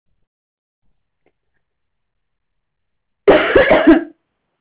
{
  "cough_length": "4.6 s",
  "cough_amplitude": 32166,
  "cough_signal_mean_std_ratio": 0.31,
  "survey_phase": "alpha (2021-03-01 to 2021-08-12)",
  "age": "45-64",
  "gender": "Female",
  "wearing_mask": "Yes",
  "symptom_none": true,
  "smoker_status": "Never smoked",
  "respiratory_condition_asthma": false,
  "respiratory_condition_other": false,
  "recruitment_source": "REACT",
  "submission_delay": "7 days",
  "covid_test_result": "Negative",
  "covid_test_method": "RT-qPCR"
}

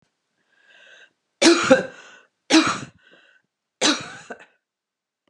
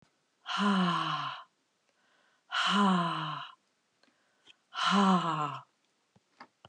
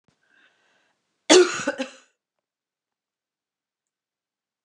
{
  "three_cough_length": "5.3 s",
  "three_cough_amplitude": 28178,
  "three_cough_signal_mean_std_ratio": 0.32,
  "exhalation_length": "6.7 s",
  "exhalation_amplitude": 6633,
  "exhalation_signal_mean_std_ratio": 0.53,
  "cough_length": "4.6 s",
  "cough_amplitude": 29205,
  "cough_signal_mean_std_ratio": 0.2,
  "survey_phase": "beta (2021-08-13 to 2022-03-07)",
  "age": "45-64",
  "gender": "Female",
  "wearing_mask": "No",
  "symptom_cough_any": true,
  "symptom_new_continuous_cough": true,
  "symptom_runny_or_blocked_nose": true,
  "symptom_shortness_of_breath": true,
  "symptom_fatigue": true,
  "symptom_fever_high_temperature": true,
  "symptom_headache": true,
  "symptom_other": true,
  "smoker_status": "Ex-smoker",
  "respiratory_condition_asthma": false,
  "respiratory_condition_other": false,
  "recruitment_source": "Test and Trace",
  "submission_delay": "1 day",
  "covid_test_result": "Positive",
  "covid_test_method": "RT-qPCR",
  "covid_ct_value": 23.9,
  "covid_ct_gene": "ORF1ab gene",
  "covid_ct_mean": 24.4,
  "covid_viral_load": "10000 copies/ml",
  "covid_viral_load_category": "Low viral load (10K-1M copies/ml)"
}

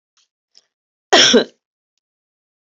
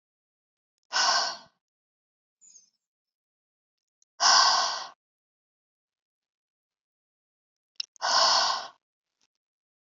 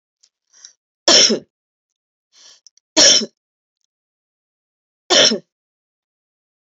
{
  "cough_length": "2.6 s",
  "cough_amplitude": 32768,
  "cough_signal_mean_std_ratio": 0.27,
  "exhalation_length": "9.9 s",
  "exhalation_amplitude": 14236,
  "exhalation_signal_mean_std_ratio": 0.31,
  "three_cough_length": "6.7 s",
  "three_cough_amplitude": 32768,
  "three_cough_signal_mean_std_ratio": 0.28,
  "survey_phase": "beta (2021-08-13 to 2022-03-07)",
  "age": "45-64",
  "gender": "Female",
  "wearing_mask": "No",
  "symptom_none": true,
  "smoker_status": "Current smoker (1 to 10 cigarettes per day)",
  "respiratory_condition_asthma": false,
  "respiratory_condition_other": false,
  "recruitment_source": "REACT",
  "submission_delay": "1 day",
  "covid_test_result": "Negative",
  "covid_test_method": "RT-qPCR"
}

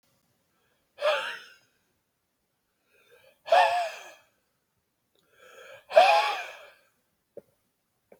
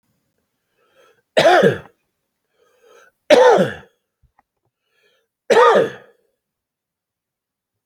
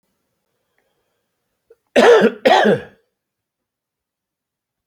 {
  "exhalation_length": "8.2 s",
  "exhalation_amplitude": 19347,
  "exhalation_signal_mean_std_ratio": 0.29,
  "three_cough_length": "7.9 s",
  "three_cough_amplitude": 32767,
  "three_cough_signal_mean_std_ratio": 0.32,
  "cough_length": "4.9 s",
  "cough_amplitude": 28910,
  "cough_signal_mean_std_ratio": 0.31,
  "survey_phase": "alpha (2021-03-01 to 2021-08-12)",
  "age": "65+",
  "gender": "Male",
  "wearing_mask": "No",
  "symptom_none": true,
  "smoker_status": "Never smoked",
  "respiratory_condition_asthma": false,
  "respiratory_condition_other": false,
  "recruitment_source": "REACT",
  "submission_delay": "1 day",
  "covid_test_result": "Negative",
  "covid_test_method": "RT-qPCR"
}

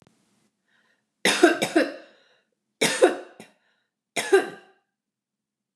{
  "three_cough_length": "5.8 s",
  "three_cough_amplitude": 25148,
  "three_cough_signal_mean_std_ratio": 0.32,
  "survey_phase": "beta (2021-08-13 to 2022-03-07)",
  "age": "65+",
  "gender": "Female",
  "wearing_mask": "No",
  "symptom_none": true,
  "smoker_status": "Never smoked",
  "respiratory_condition_asthma": false,
  "respiratory_condition_other": false,
  "recruitment_source": "REACT",
  "submission_delay": "2 days",
  "covid_test_result": "Negative",
  "covid_test_method": "RT-qPCR",
  "influenza_a_test_result": "Negative",
  "influenza_b_test_result": "Negative"
}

